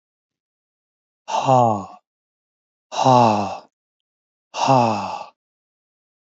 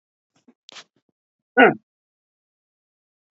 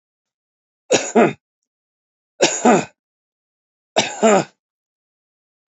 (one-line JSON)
{"exhalation_length": "6.3 s", "exhalation_amplitude": 27062, "exhalation_signal_mean_std_ratio": 0.4, "cough_length": "3.3 s", "cough_amplitude": 27373, "cough_signal_mean_std_ratio": 0.17, "three_cough_length": "5.7 s", "three_cough_amplitude": 29047, "three_cough_signal_mean_std_ratio": 0.32, "survey_phase": "beta (2021-08-13 to 2022-03-07)", "age": "45-64", "gender": "Male", "wearing_mask": "No", "symptom_none": true, "smoker_status": "Ex-smoker", "respiratory_condition_asthma": false, "respiratory_condition_other": false, "recruitment_source": "REACT", "submission_delay": "6 days", "covid_test_result": "Negative", "covid_test_method": "RT-qPCR"}